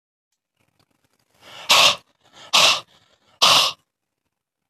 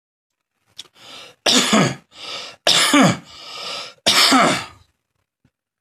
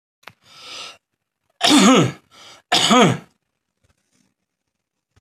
exhalation_length: 4.7 s
exhalation_amplitude: 29027
exhalation_signal_mean_std_ratio: 0.34
three_cough_length: 5.8 s
three_cough_amplitude: 32767
three_cough_signal_mean_std_ratio: 0.47
cough_length: 5.2 s
cough_amplitude: 26930
cough_signal_mean_std_ratio: 0.36
survey_phase: alpha (2021-03-01 to 2021-08-12)
age: 45-64
gender: Male
wearing_mask: 'No'
symptom_none: true
smoker_status: Ex-smoker
respiratory_condition_asthma: false
respiratory_condition_other: false
recruitment_source: REACT
submission_delay: 2 days
covid_test_result: Negative
covid_test_method: RT-qPCR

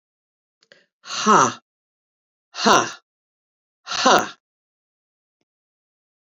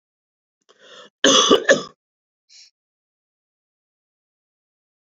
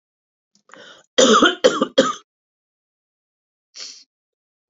exhalation_length: 6.4 s
exhalation_amplitude: 29691
exhalation_signal_mean_std_ratio: 0.29
cough_length: 5.0 s
cough_amplitude: 32767
cough_signal_mean_std_ratio: 0.25
three_cough_length: 4.7 s
three_cough_amplitude: 32768
three_cough_signal_mean_std_ratio: 0.3
survey_phase: beta (2021-08-13 to 2022-03-07)
age: 65+
gender: Female
wearing_mask: 'No'
symptom_cough_any: true
symptom_new_continuous_cough: true
symptom_runny_or_blocked_nose: true
symptom_fatigue: true
smoker_status: Ex-smoker
respiratory_condition_asthma: false
respiratory_condition_other: true
recruitment_source: Test and Trace
submission_delay: 2 days
covid_test_result: Positive
covid_test_method: RT-qPCR
covid_ct_value: 28.2
covid_ct_gene: ORF1ab gene
covid_ct_mean: 28.5
covid_viral_load: 430 copies/ml
covid_viral_load_category: Minimal viral load (< 10K copies/ml)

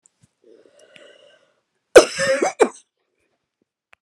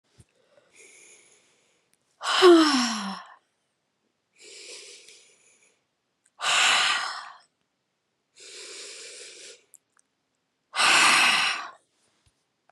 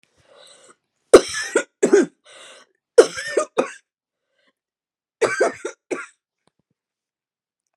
cough_length: 4.0 s
cough_amplitude: 32768
cough_signal_mean_std_ratio: 0.23
exhalation_length: 12.7 s
exhalation_amplitude: 19396
exhalation_signal_mean_std_ratio: 0.36
three_cough_length: 7.8 s
three_cough_amplitude: 32768
three_cough_signal_mean_std_ratio: 0.26
survey_phase: beta (2021-08-13 to 2022-03-07)
age: 45-64
gender: Female
wearing_mask: 'No'
symptom_cough_any: true
symptom_runny_or_blocked_nose: true
symptom_fatigue: true
symptom_fever_high_temperature: true
symptom_headache: true
smoker_status: Never smoked
respiratory_condition_asthma: false
respiratory_condition_other: false
recruitment_source: Test and Trace
submission_delay: 3 days
covid_test_result: Positive
covid_test_method: RT-qPCR
covid_ct_value: 20.4
covid_ct_gene: ORF1ab gene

